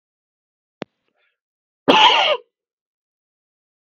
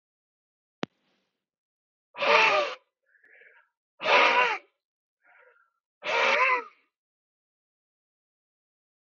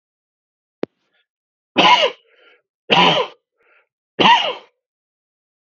{"cough_length": "3.8 s", "cough_amplitude": 32768, "cough_signal_mean_std_ratio": 0.28, "exhalation_length": "9.0 s", "exhalation_amplitude": 16682, "exhalation_signal_mean_std_ratio": 0.34, "three_cough_length": "5.7 s", "three_cough_amplitude": 32768, "three_cough_signal_mean_std_ratio": 0.34, "survey_phase": "beta (2021-08-13 to 2022-03-07)", "age": "18-44", "gender": "Male", "wearing_mask": "No", "symptom_none": true, "smoker_status": "Never smoked", "respiratory_condition_asthma": false, "respiratory_condition_other": false, "recruitment_source": "REACT", "submission_delay": "1 day", "covid_test_result": "Negative", "covid_test_method": "RT-qPCR", "influenza_a_test_result": "Negative", "influenza_b_test_result": "Negative"}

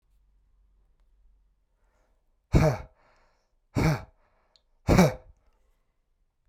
{"exhalation_length": "6.5 s", "exhalation_amplitude": 16889, "exhalation_signal_mean_std_ratio": 0.27, "survey_phase": "beta (2021-08-13 to 2022-03-07)", "age": "45-64", "gender": "Male", "wearing_mask": "No", "symptom_runny_or_blocked_nose": true, "smoker_status": "Ex-smoker", "respiratory_condition_asthma": true, "respiratory_condition_other": false, "recruitment_source": "Test and Trace", "submission_delay": "2 days", "covid_test_result": "Negative", "covid_test_method": "RT-qPCR"}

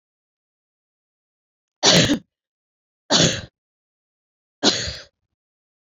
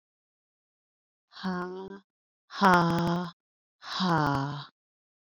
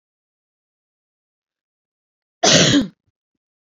{"three_cough_length": "5.8 s", "three_cough_amplitude": 28589, "three_cough_signal_mean_std_ratio": 0.3, "exhalation_length": "5.4 s", "exhalation_amplitude": 14350, "exhalation_signal_mean_std_ratio": 0.43, "cough_length": "3.8 s", "cough_amplitude": 30394, "cough_signal_mean_std_ratio": 0.28, "survey_phase": "beta (2021-08-13 to 2022-03-07)", "age": "18-44", "gender": "Female", "wearing_mask": "No", "symptom_headache": true, "smoker_status": "Never smoked", "respiratory_condition_asthma": false, "respiratory_condition_other": false, "recruitment_source": "REACT", "submission_delay": "1 day", "covid_test_result": "Negative", "covid_test_method": "RT-qPCR"}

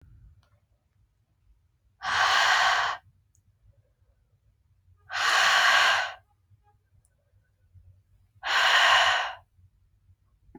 {"exhalation_length": "10.6 s", "exhalation_amplitude": 13040, "exhalation_signal_mean_std_ratio": 0.44, "survey_phase": "beta (2021-08-13 to 2022-03-07)", "age": "18-44", "gender": "Female", "wearing_mask": "No", "symptom_cough_any": true, "symptom_runny_or_blocked_nose": true, "symptom_sore_throat": true, "symptom_diarrhoea": true, "symptom_other": true, "smoker_status": "Never smoked", "respiratory_condition_asthma": false, "respiratory_condition_other": false, "recruitment_source": "Test and Trace", "submission_delay": "1 day", "covid_test_result": "Positive", "covid_test_method": "RT-qPCR", "covid_ct_value": 30.0, "covid_ct_gene": "N gene"}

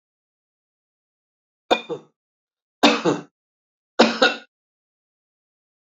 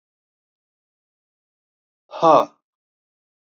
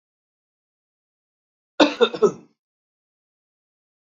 {"three_cough_length": "6.0 s", "three_cough_amplitude": 28947, "three_cough_signal_mean_std_ratio": 0.26, "exhalation_length": "3.6 s", "exhalation_amplitude": 28444, "exhalation_signal_mean_std_ratio": 0.2, "cough_length": "4.0 s", "cough_amplitude": 32768, "cough_signal_mean_std_ratio": 0.21, "survey_phase": "beta (2021-08-13 to 2022-03-07)", "age": "45-64", "gender": "Male", "wearing_mask": "No", "symptom_none": true, "smoker_status": "Never smoked", "respiratory_condition_asthma": true, "respiratory_condition_other": false, "recruitment_source": "REACT", "submission_delay": "1 day", "covid_test_result": "Negative", "covid_test_method": "RT-qPCR"}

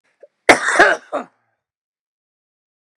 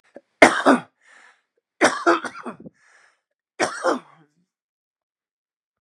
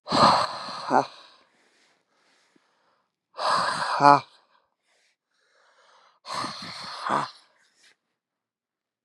{"cough_length": "3.0 s", "cough_amplitude": 32768, "cough_signal_mean_std_ratio": 0.29, "three_cough_length": "5.8 s", "three_cough_amplitude": 32768, "three_cough_signal_mean_std_ratio": 0.28, "exhalation_length": "9.0 s", "exhalation_amplitude": 30754, "exhalation_signal_mean_std_ratio": 0.32, "survey_phase": "beta (2021-08-13 to 2022-03-07)", "age": "45-64", "gender": "Male", "wearing_mask": "No", "symptom_none": true, "smoker_status": "Current smoker (11 or more cigarettes per day)", "respiratory_condition_asthma": false, "respiratory_condition_other": false, "recruitment_source": "REACT", "submission_delay": "2 days", "covid_test_result": "Negative", "covid_test_method": "RT-qPCR", "influenza_a_test_result": "Unknown/Void", "influenza_b_test_result": "Unknown/Void"}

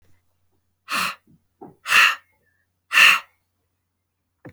{"exhalation_length": "4.5 s", "exhalation_amplitude": 27696, "exhalation_signal_mean_std_ratio": 0.3, "survey_phase": "alpha (2021-03-01 to 2021-08-12)", "age": "45-64", "gender": "Female", "wearing_mask": "No", "symptom_cough_any": true, "symptom_abdominal_pain": true, "symptom_fatigue": true, "symptom_change_to_sense_of_smell_or_taste": true, "smoker_status": "Never smoked", "respiratory_condition_asthma": false, "respiratory_condition_other": false, "recruitment_source": "Test and Trace", "submission_delay": "2 days", "covid_test_result": "Positive", "covid_test_method": "RT-qPCR", "covid_ct_value": 16.2, "covid_ct_gene": "ORF1ab gene", "covid_ct_mean": 16.5, "covid_viral_load": "4000000 copies/ml", "covid_viral_load_category": "High viral load (>1M copies/ml)"}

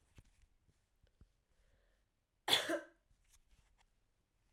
{"cough_length": "4.5 s", "cough_amplitude": 4889, "cough_signal_mean_std_ratio": 0.22, "survey_phase": "beta (2021-08-13 to 2022-03-07)", "age": "18-44", "gender": "Female", "wearing_mask": "No", "symptom_cough_any": true, "symptom_runny_or_blocked_nose": true, "symptom_sore_throat": true, "symptom_fatigue": true, "symptom_headache": true, "symptom_other": true, "symptom_onset": "3 days", "smoker_status": "Never smoked", "respiratory_condition_asthma": false, "respiratory_condition_other": false, "recruitment_source": "Test and Trace", "submission_delay": "1 day", "covid_test_result": "Positive", "covid_test_method": "RT-qPCR", "covid_ct_value": 23.2, "covid_ct_gene": "ORF1ab gene", "covid_ct_mean": 23.5, "covid_viral_load": "19000 copies/ml", "covid_viral_load_category": "Low viral load (10K-1M copies/ml)"}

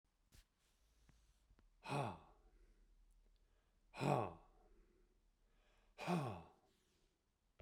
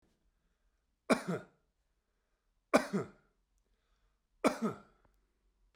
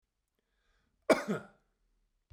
{"exhalation_length": "7.6 s", "exhalation_amplitude": 2278, "exhalation_signal_mean_std_ratio": 0.31, "three_cough_length": "5.8 s", "three_cough_amplitude": 8710, "three_cough_signal_mean_std_ratio": 0.24, "cough_length": "2.3 s", "cough_amplitude": 9966, "cough_signal_mean_std_ratio": 0.22, "survey_phase": "beta (2021-08-13 to 2022-03-07)", "age": "65+", "gender": "Male", "wearing_mask": "No", "symptom_none": true, "smoker_status": "Never smoked", "respiratory_condition_asthma": false, "respiratory_condition_other": false, "recruitment_source": "REACT", "submission_delay": "1 day", "covid_test_result": "Negative", "covid_test_method": "RT-qPCR"}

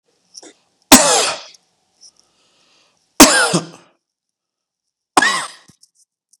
{"three_cough_length": "6.4 s", "three_cough_amplitude": 32768, "three_cough_signal_mean_std_ratio": 0.3, "survey_phase": "beta (2021-08-13 to 2022-03-07)", "age": "45-64", "gender": "Male", "wearing_mask": "No", "symptom_none": true, "smoker_status": "Current smoker (1 to 10 cigarettes per day)", "respiratory_condition_asthma": false, "respiratory_condition_other": false, "recruitment_source": "REACT", "submission_delay": "1 day", "covid_test_result": "Negative", "covid_test_method": "RT-qPCR", "influenza_a_test_result": "Negative", "influenza_b_test_result": "Negative"}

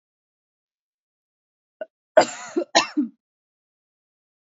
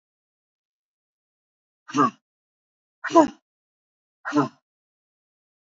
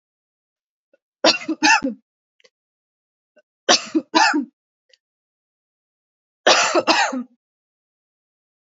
{"cough_length": "4.4 s", "cough_amplitude": 27385, "cough_signal_mean_std_ratio": 0.22, "exhalation_length": "5.6 s", "exhalation_amplitude": 26297, "exhalation_signal_mean_std_ratio": 0.21, "three_cough_length": "8.7 s", "three_cough_amplitude": 29051, "three_cough_signal_mean_std_ratio": 0.33, "survey_phase": "beta (2021-08-13 to 2022-03-07)", "age": "18-44", "gender": "Female", "wearing_mask": "No", "symptom_cough_any": true, "symptom_runny_or_blocked_nose": true, "symptom_fatigue": true, "symptom_headache": true, "symptom_onset": "3 days", "smoker_status": "Never smoked", "respiratory_condition_asthma": false, "respiratory_condition_other": false, "recruitment_source": "Test and Trace", "submission_delay": "2 days", "covid_test_result": "Positive", "covid_test_method": "RT-qPCR", "covid_ct_value": 26.8, "covid_ct_gene": "ORF1ab gene", "covid_ct_mean": 27.1, "covid_viral_load": "1300 copies/ml", "covid_viral_load_category": "Minimal viral load (< 10K copies/ml)"}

